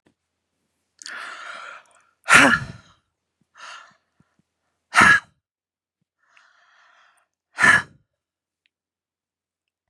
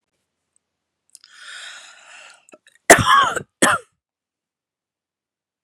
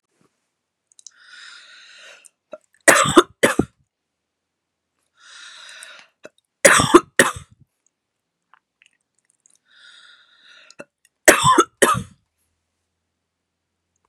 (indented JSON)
{
  "exhalation_length": "9.9 s",
  "exhalation_amplitude": 32767,
  "exhalation_signal_mean_std_ratio": 0.24,
  "cough_length": "5.6 s",
  "cough_amplitude": 32768,
  "cough_signal_mean_std_ratio": 0.25,
  "three_cough_length": "14.1 s",
  "three_cough_amplitude": 32768,
  "three_cough_signal_mean_std_ratio": 0.24,
  "survey_phase": "beta (2021-08-13 to 2022-03-07)",
  "age": "65+",
  "gender": "Female",
  "wearing_mask": "No",
  "symptom_none": true,
  "smoker_status": "Ex-smoker",
  "respiratory_condition_asthma": false,
  "respiratory_condition_other": false,
  "recruitment_source": "REACT",
  "submission_delay": "6 days",
  "covid_test_result": "Negative",
  "covid_test_method": "RT-qPCR"
}